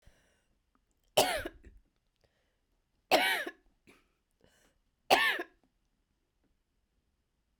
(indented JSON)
{
  "three_cough_length": "7.6 s",
  "three_cough_amplitude": 9732,
  "three_cough_signal_mean_std_ratio": 0.27,
  "survey_phase": "beta (2021-08-13 to 2022-03-07)",
  "age": "45-64",
  "gender": "Female",
  "wearing_mask": "No",
  "symptom_cough_any": true,
  "symptom_runny_or_blocked_nose": true,
  "symptom_shortness_of_breath": true,
  "symptom_fatigue": true,
  "symptom_onset": "3 days",
  "smoker_status": "Never smoked",
  "respiratory_condition_asthma": true,
  "respiratory_condition_other": false,
  "recruitment_source": "Test and Trace",
  "submission_delay": "2 days",
  "covid_test_result": "Positive",
  "covid_test_method": "RT-qPCR"
}